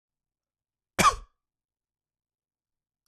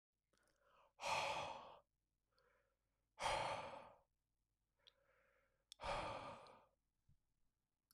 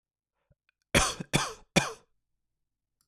{"cough_length": "3.1 s", "cough_amplitude": 13226, "cough_signal_mean_std_ratio": 0.18, "exhalation_length": "7.9 s", "exhalation_amplitude": 1076, "exhalation_signal_mean_std_ratio": 0.4, "three_cough_length": "3.1 s", "three_cough_amplitude": 16254, "three_cough_signal_mean_std_ratio": 0.29, "survey_phase": "beta (2021-08-13 to 2022-03-07)", "age": "18-44", "gender": "Male", "wearing_mask": "No", "symptom_cough_any": true, "smoker_status": "Never smoked", "respiratory_condition_asthma": false, "respiratory_condition_other": false, "recruitment_source": "Test and Trace", "submission_delay": "2 days", "covid_test_result": "Positive", "covid_test_method": "ePCR"}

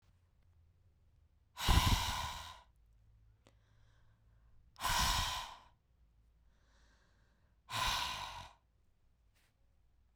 {"exhalation_length": "10.2 s", "exhalation_amplitude": 5252, "exhalation_signal_mean_std_ratio": 0.36, "survey_phase": "beta (2021-08-13 to 2022-03-07)", "age": "45-64", "gender": "Female", "wearing_mask": "No", "symptom_none": true, "symptom_onset": "3 days", "smoker_status": "Never smoked", "respiratory_condition_asthma": false, "respiratory_condition_other": false, "recruitment_source": "REACT", "submission_delay": "2 days", "covid_test_result": "Negative", "covid_test_method": "RT-qPCR", "influenza_a_test_result": "Negative", "influenza_b_test_result": "Negative"}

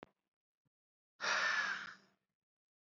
{"exhalation_length": "2.8 s", "exhalation_amplitude": 2151, "exhalation_signal_mean_std_ratio": 0.4, "survey_phase": "beta (2021-08-13 to 2022-03-07)", "age": "18-44", "gender": "Male", "wearing_mask": "No", "symptom_none": true, "smoker_status": "Never smoked", "respiratory_condition_asthma": false, "respiratory_condition_other": false, "recruitment_source": "REACT", "submission_delay": "2 days", "covid_test_result": "Negative", "covid_test_method": "RT-qPCR", "influenza_a_test_result": "Negative", "influenza_b_test_result": "Negative"}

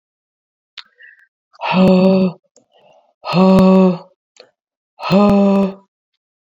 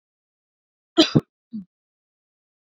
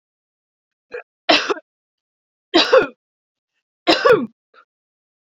{"exhalation_length": "6.6 s", "exhalation_amplitude": 27583, "exhalation_signal_mean_std_ratio": 0.51, "cough_length": "2.7 s", "cough_amplitude": 28390, "cough_signal_mean_std_ratio": 0.19, "three_cough_length": "5.2 s", "three_cough_amplitude": 29788, "three_cough_signal_mean_std_ratio": 0.31, "survey_phase": "beta (2021-08-13 to 2022-03-07)", "age": "45-64", "gender": "Female", "wearing_mask": "No", "symptom_none": true, "smoker_status": "Never smoked", "respiratory_condition_asthma": false, "respiratory_condition_other": false, "recruitment_source": "REACT", "submission_delay": "1 day", "covid_test_result": "Negative", "covid_test_method": "RT-qPCR"}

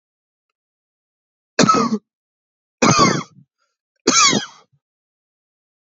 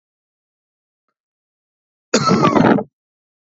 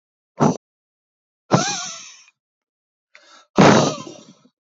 {"three_cough_length": "5.9 s", "three_cough_amplitude": 32768, "three_cough_signal_mean_std_ratio": 0.35, "cough_length": "3.6 s", "cough_amplitude": 32768, "cough_signal_mean_std_ratio": 0.34, "exhalation_length": "4.8 s", "exhalation_amplitude": 28128, "exhalation_signal_mean_std_ratio": 0.32, "survey_phase": "beta (2021-08-13 to 2022-03-07)", "age": "45-64", "gender": "Male", "wearing_mask": "No", "symptom_none": true, "smoker_status": "Ex-smoker", "respiratory_condition_asthma": false, "respiratory_condition_other": false, "recruitment_source": "REACT", "submission_delay": "1 day", "covid_test_result": "Negative", "covid_test_method": "RT-qPCR", "influenza_a_test_result": "Negative", "influenza_b_test_result": "Negative"}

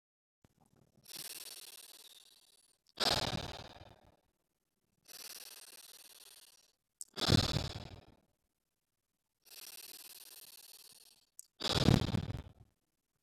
{"exhalation_length": "13.2 s", "exhalation_amplitude": 8552, "exhalation_signal_mean_std_ratio": 0.29, "survey_phase": "beta (2021-08-13 to 2022-03-07)", "age": "18-44", "gender": "Male", "wearing_mask": "No", "symptom_none": true, "smoker_status": "Never smoked", "respiratory_condition_asthma": true, "respiratory_condition_other": false, "recruitment_source": "REACT", "submission_delay": "1 day", "covid_test_result": "Negative", "covid_test_method": "RT-qPCR"}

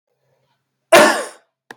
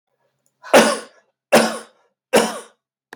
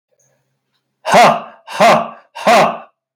{"cough_length": "1.8 s", "cough_amplitude": 32768, "cough_signal_mean_std_ratio": 0.32, "three_cough_length": "3.2 s", "three_cough_amplitude": 32768, "three_cough_signal_mean_std_ratio": 0.34, "exhalation_length": "3.2 s", "exhalation_amplitude": 32767, "exhalation_signal_mean_std_ratio": 0.47, "survey_phase": "beta (2021-08-13 to 2022-03-07)", "age": "45-64", "gender": "Male", "wearing_mask": "No", "symptom_none": true, "smoker_status": "Never smoked", "respiratory_condition_asthma": false, "respiratory_condition_other": false, "recruitment_source": "REACT", "submission_delay": "1 day", "covid_test_result": "Negative", "covid_test_method": "RT-qPCR", "influenza_a_test_result": "Negative", "influenza_b_test_result": "Negative"}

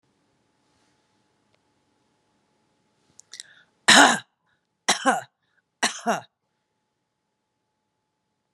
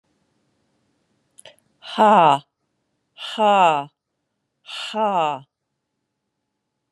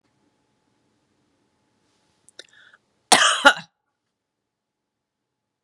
{"three_cough_length": "8.5 s", "three_cough_amplitude": 32767, "three_cough_signal_mean_std_ratio": 0.21, "exhalation_length": "6.9 s", "exhalation_amplitude": 26068, "exhalation_signal_mean_std_ratio": 0.34, "cough_length": "5.6 s", "cough_amplitude": 32768, "cough_signal_mean_std_ratio": 0.19, "survey_phase": "beta (2021-08-13 to 2022-03-07)", "age": "45-64", "gender": "Female", "wearing_mask": "No", "symptom_cough_any": true, "symptom_runny_or_blocked_nose": true, "symptom_diarrhoea": true, "symptom_fatigue": true, "symptom_headache": true, "symptom_change_to_sense_of_smell_or_taste": true, "symptom_other": true, "symptom_onset": "3 days", "smoker_status": "Never smoked", "respiratory_condition_asthma": false, "respiratory_condition_other": false, "recruitment_source": "Test and Trace", "submission_delay": "2 days", "covid_test_result": "Positive", "covid_test_method": "RT-qPCR", "covid_ct_value": 16.8, "covid_ct_gene": "ORF1ab gene", "covid_ct_mean": 17.0, "covid_viral_load": "2600000 copies/ml", "covid_viral_load_category": "High viral load (>1M copies/ml)"}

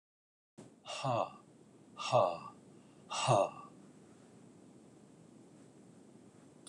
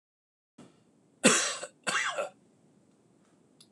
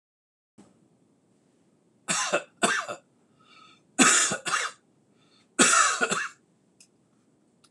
{"exhalation_length": "6.7 s", "exhalation_amplitude": 5854, "exhalation_signal_mean_std_ratio": 0.36, "cough_length": "3.7 s", "cough_amplitude": 14714, "cough_signal_mean_std_ratio": 0.33, "three_cough_length": "7.7 s", "three_cough_amplitude": 21509, "three_cough_signal_mean_std_ratio": 0.37, "survey_phase": "beta (2021-08-13 to 2022-03-07)", "age": "45-64", "gender": "Male", "wearing_mask": "No", "symptom_none": true, "smoker_status": "Never smoked", "respiratory_condition_asthma": false, "respiratory_condition_other": false, "recruitment_source": "REACT", "submission_delay": "1 day", "covid_test_result": "Negative", "covid_test_method": "RT-qPCR"}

